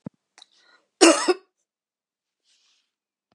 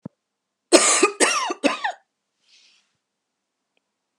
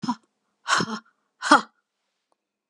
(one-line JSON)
{"cough_length": "3.3 s", "cough_amplitude": 29628, "cough_signal_mean_std_ratio": 0.22, "three_cough_length": "4.2 s", "three_cough_amplitude": 32768, "three_cough_signal_mean_std_ratio": 0.34, "exhalation_length": "2.7 s", "exhalation_amplitude": 28356, "exhalation_signal_mean_std_ratio": 0.29, "survey_phase": "beta (2021-08-13 to 2022-03-07)", "age": "45-64", "gender": "Female", "wearing_mask": "No", "symptom_sore_throat": true, "symptom_onset": "5 days", "smoker_status": "Never smoked", "respiratory_condition_asthma": false, "respiratory_condition_other": false, "recruitment_source": "REACT", "submission_delay": "0 days", "covid_test_result": "Negative", "covid_test_method": "RT-qPCR", "influenza_a_test_result": "Unknown/Void", "influenza_b_test_result": "Unknown/Void"}